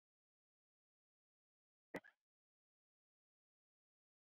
{"cough_length": "4.4 s", "cough_amplitude": 705, "cough_signal_mean_std_ratio": 0.09, "survey_phase": "beta (2021-08-13 to 2022-03-07)", "age": "45-64", "gender": "Female", "wearing_mask": "No", "symptom_cough_any": true, "symptom_fatigue": true, "smoker_status": "Current smoker (1 to 10 cigarettes per day)", "respiratory_condition_asthma": false, "respiratory_condition_other": false, "recruitment_source": "REACT", "submission_delay": "1 day", "covid_test_result": "Negative", "covid_test_method": "RT-qPCR", "influenza_a_test_result": "Negative", "influenza_b_test_result": "Negative"}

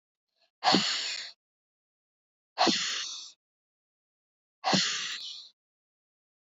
{"exhalation_length": "6.5 s", "exhalation_amplitude": 12241, "exhalation_signal_mean_std_ratio": 0.39, "survey_phase": "beta (2021-08-13 to 2022-03-07)", "age": "45-64", "gender": "Female", "wearing_mask": "No", "symptom_cough_any": true, "symptom_runny_or_blocked_nose": true, "symptom_sore_throat": true, "symptom_fatigue": true, "symptom_onset": "6 days", "smoker_status": "Never smoked", "respiratory_condition_asthma": false, "respiratory_condition_other": false, "recruitment_source": "Test and Trace", "submission_delay": "1 day", "covid_test_result": "Positive", "covid_test_method": "RT-qPCR", "covid_ct_value": 24.6, "covid_ct_gene": "N gene"}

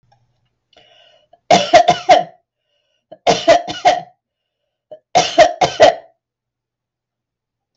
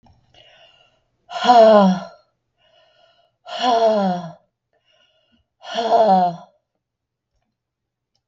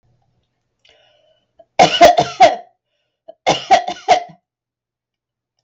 {"three_cough_length": "7.8 s", "three_cough_amplitude": 32768, "three_cough_signal_mean_std_ratio": 0.35, "exhalation_length": "8.3 s", "exhalation_amplitude": 31318, "exhalation_signal_mean_std_ratio": 0.39, "cough_length": "5.6 s", "cough_amplitude": 32768, "cough_signal_mean_std_ratio": 0.32, "survey_phase": "beta (2021-08-13 to 2022-03-07)", "age": "45-64", "gender": "Female", "wearing_mask": "No", "symptom_none": true, "smoker_status": "Never smoked", "respiratory_condition_asthma": false, "respiratory_condition_other": false, "recruitment_source": "REACT", "submission_delay": "2 days", "covid_test_result": "Negative", "covid_test_method": "RT-qPCR"}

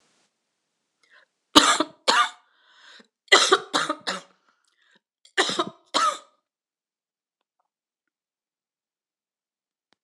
{"three_cough_length": "10.0 s", "three_cough_amplitude": 26028, "three_cough_signal_mean_std_ratio": 0.27, "survey_phase": "beta (2021-08-13 to 2022-03-07)", "age": "45-64", "gender": "Female", "wearing_mask": "No", "symptom_cough_any": true, "symptom_runny_or_blocked_nose": true, "symptom_fatigue": true, "symptom_headache": true, "smoker_status": "Never smoked", "respiratory_condition_asthma": false, "respiratory_condition_other": false, "recruitment_source": "Test and Trace", "submission_delay": "2 days", "covid_test_result": "Positive", "covid_test_method": "RT-qPCR"}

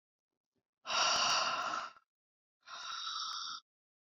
{"exhalation_length": "4.2 s", "exhalation_amplitude": 3267, "exhalation_signal_mean_std_ratio": 0.53, "survey_phase": "beta (2021-08-13 to 2022-03-07)", "age": "45-64", "gender": "Female", "wearing_mask": "No", "symptom_none": true, "smoker_status": "Never smoked", "respiratory_condition_asthma": false, "respiratory_condition_other": false, "recruitment_source": "REACT", "submission_delay": "3 days", "covid_test_result": "Negative", "covid_test_method": "RT-qPCR"}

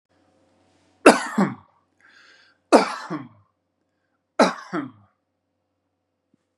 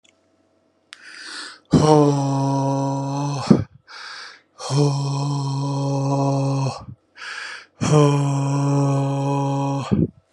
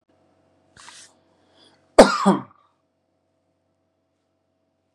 {"three_cough_length": "6.6 s", "three_cough_amplitude": 32768, "three_cough_signal_mean_std_ratio": 0.23, "exhalation_length": "10.3 s", "exhalation_amplitude": 32755, "exhalation_signal_mean_std_ratio": 0.76, "cough_length": "4.9 s", "cough_amplitude": 32768, "cough_signal_mean_std_ratio": 0.18, "survey_phase": "beta (2021-08-13 to 2022-03-07)", "age": "18-44", "gender": "Male", "wearing_mask": "No", "symptom_none": true, "smoker_status": "Ex-smoker", "respiratory_condition_asthma": true, "respiratory_condition_other": false, "recruitment_source": "REACT", "submission_delay": "2 days", "covid_test_result": "Negative", "covid_test_method": "RT-qPCR"}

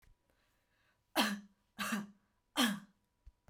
{"three_cough_length": "3.5 s", "three_cough_amplitude": 4312, "three_cough_signal_mean_std_ratio": 0.36, "survey_phase": "beta (2021-08-13 to 2022-03-07)", "age": "18-44", "gender": "Female", "wearing_mask": "No", "symptom_none": true, "smoker_status": "Never smoked", "respiratory_condition_asthma": false, "respiratory_condition_other": false, "recruitment_source": "REACT", "submission_delay": "4 days", "covid_test_result": "Negative", "covid_test_method": "RT-qPCR"}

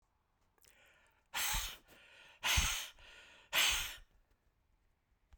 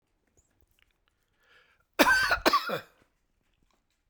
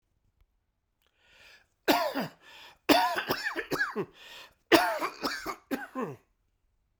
{"exhalation_length": "5.4 s", "exhalation_amplitude": 3908, "exhalation_signal_mean_std_ratio": 0.4, "cough_length": "4.1 s", "cough_amplitude": 18574, "cough_signal_mean_std_ratio": 0.31, "three_cough_length": "7.0 s", "three_cough_amplitude": 20222, "three_cough_signal_mean_std_ratio": 0.41, "survey_phase": "beta (2021-08-13 to 2022-03-07)", "age": "45-64", "gender": "Male", "wearing_mask": "No", "symptom_fatigue": true, "smoker_status": "Ex-smoker", "respiratory_condition_asthma": false, "respiratory_condition_other": false, "recruitment_source": "REACT", "submission_delay": "0 days", "covid_test_result": "Negative", "covid_test_method": "RT-qPCR"}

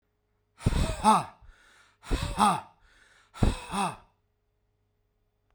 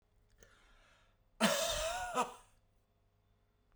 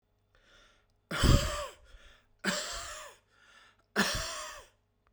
{"exhalation_length": "5.5 s", "exhalation_amplitude": 13869, "exhalation_signal_mean_std_ratio": 0.38, "cough_length": "3.8 s", "cough_amplitude": 5398, "cough_signal_mean_std_ratio": 0.4, "three_cough_length": "5.1 s", "three_cough_amplitude": 11522, "three_cough_signal_mean_std_ratio": 0.38, "survey_phase": "beta (2021-08-13 to 2022-03-07)", "age": "45-64", "gender": "Male", "wearing_mask": "No", "symptom_cough_any": true, "symptom_fatigue": true, "symptom_headache": true, "symptom_onset": "3 days", "smoker_status": "Current smoker (1 to 10 cigarettes per day)", "respiratory_condition_asthma": false, "respiratory_condition_other": false, "recruitment_source": "Test and Trace", "submission_delay": "2 days", "covid_test_result": "Positive", "covid_test_method": "RT-qPCR", "covid_ct_value": 18.4, "covid_ct_gene": "N gene", "covid_ct_mean": 19.1, "covid_viral_load": "520000 copies/ml", "covid_viral_load_category": "Low viral load (10K-1M copies/ml)"}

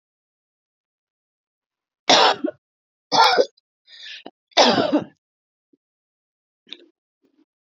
{"three_cough_length": "7.7 s", "three_cough_amplitude": 31168, "three_cough_signal_mean_std_ratio": 0.3, "survey_phase": "beta (2021-08-13 to 2022-03-07)", "age": "45-64", "gender": "Female", "wearing_mask": "No", "symptom_cough_any": true, "symptom_fatigue": true, "smoker_status": "Never smoked", "respiratory_condition_asthma": false, "respiratory_condition_other": false, "recruitment_source": "REACT", "submission_delay": "3 days", "covid_test_result": "Negative", "covid_test_method": "RT-qPCR", "influenza_a_test_result": "Negative", "influenza_b_test_result": "Negative"}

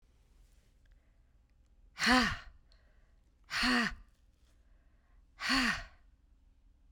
{"exhalation_length": "6.9 s", "exhalation_amplitude": 6618, "exhalation_signal_mean_std_ratio": 0.36, "survey_phase": "beta (2021-08-13 to 2022-03-07)", "age": "45-64", "gender": "Female", "wearing_mask": "No", "symptom_none": true, "smoker_status": "Never smoked", "respiratory_condition_asthma": false, "respiratory_condition_other": false, "recruitment_source": "REACT", "submission_delay": "3 days", "covid_test_result": "Negative", "covid_test_method": "RT-qPCR"}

